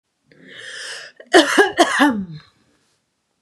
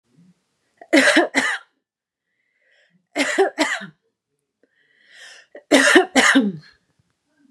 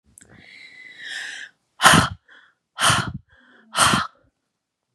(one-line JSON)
{"cough_length": "3.4 s", "cough_amplitude": 32768, "cough_signal_mean_std_ratio": 0.4, "three_cough_length": "7.5 s", "three_cough_amplitude": 32425, "three_cough_signal_mean_std_ratio": 0.39, "exhalation_length": "4.9 s", "exhalation_amplitude": 32767, "exhalation_signal_mean_std_ratio": 0.35, "survey_phase": "beta (2021-08-13 to 2022-03-07)", "age": "18-44", "gender": "Female", "wearing_mask": "No", "symptom_headache": true, "smoker_status": "Ex-smoker", "respiratory_condition_asthma": true, "respiratory_condition_other": false, "recruitment_source": "REACT", "submission_delay": "1 day", "covid_test_result": "Negative", "covid_test_method": "RT-qPCR", "influenza_a_test_result": "Unknown/Void", "influenza_b_test_result": "Unknown/Void"}